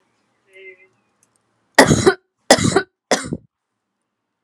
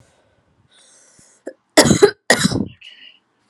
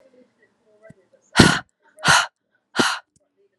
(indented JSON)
{
  "three_cough_length": "4.4 s",
  "three_cough_amplitude": 32768,
  "three_cough_signal_mean_std_ratio": 0.3,
  "cough_length": "3.5 s",
  "cough_amplitude": 32768,
  "cough_signal_mean_std_ratio": 0.31,
  "exhalation_length": "3.6 s",
  "exhalation_amplitude": 32768,
  "exhalation_signal_mean_std_ratio": 0.31,
  "survey_phase": "alpha (2021-03-01 to 2021-08-12)",
  "age": "18-44",
  "gender": "Female",
  "wearing_mask": "No",
  "symptom_cough_any": true,
  "symptom_fatigue": true,
  "symptom_change_to_sense_of_smell_or_taste": true,
  "symptom_onset": "10 days",
  "smoker_status": "Never smoked",
  "respiratory_condition_asthma": false,
  "respiratory_condition_other": false,
  "recruitment_source": "Test and Trace",
  "submission_delay": "2 days",
  "covid_test_result": "Positive",
  "covid_test_method": "RT-qPCR",
  "covid_ct_value": 19.5,
  "covid_ct_gene": "N gene",
  "covid_ct_mean": 19.7,
  "covid_viral_load": "350000 copies/ml",
  "covid_viral_load_category": "Low viral load (10K-1M copies/ml)"
}